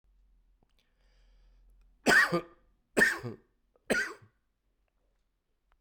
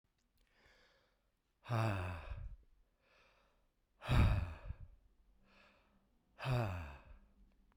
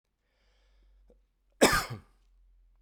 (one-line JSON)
{"three_cough_length": "5.8 s", "three_cough_amplitude": 9878, "three_cough_signal_mean_std_ratio": 0.29, "exhalation_length": "7.8 s", "exhalation_amplitude": 3179, "exhalation_signal_mean_std_ratio": 0.38, "cough_length": "2.8 s", "cough_amplitude": 16230, "cough_signal_mean_std_ratio": 0.24, "survey_phase": "beta (2021-08-13 to 2022-03-07)", "age": "45-64", "gender": "Male", "wearing_mask": "No", "symptom_new_continuous_cough": true, "symptom_shortness_of_breath": true, "symptom_sore_throat": true, "symptom_headache": true, "symptom_change_to_sense_of_smell_or_taste": true, "symptom_onset": "3 days", "smoker_status": "Ex-smoker", "respiratory_condition_asthma": false, "respiratory_condition_other": false, "recruitment_source": "Test and Trace", "submission_delay": "1 day", "covid_test_result": "Positive", "covid_test_method": "RT-qPCR", "covid_ct_value": 27.6, "covid_ct_gene": "N gene"}